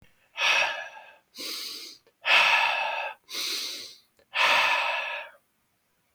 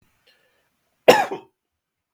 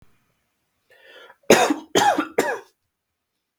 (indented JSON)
{
  "exhalation_length": "6.1 s",
  "exhalation_amplitude": 14078,
  "exhalation_signal_mean_std_ratio": 0.57,
  "cough_length": "2.1 s",
  "cough_amplitude": 32768,
  "cough_signal_mean_std_ratio": 0.21,
  "three_cough_length": "3.6 s",
  "three_cough_amplitude": 32768,
  "three_cough_signal_mean_std_ratio": 0.34,
  "survey_phase": "beta (2021-08-13 to 2022-03-07)",
  "age": "18-44",
  "gender": "Male",
  "wearing_mask": "No",
  "symptom_runny_or_blocked_nose": true,
  "symptom_onset": "6 days",
  "smoker_status": "Never smoked",
  "respiratory_condition_asthma": false,
  "respiratory_condition_other": false,
  "recruitment_source": "REACT",
  "submission_delay": "4 days",
  "covid_test_result": "Negative",
  "covid_test_method": "RT-qPCR"
}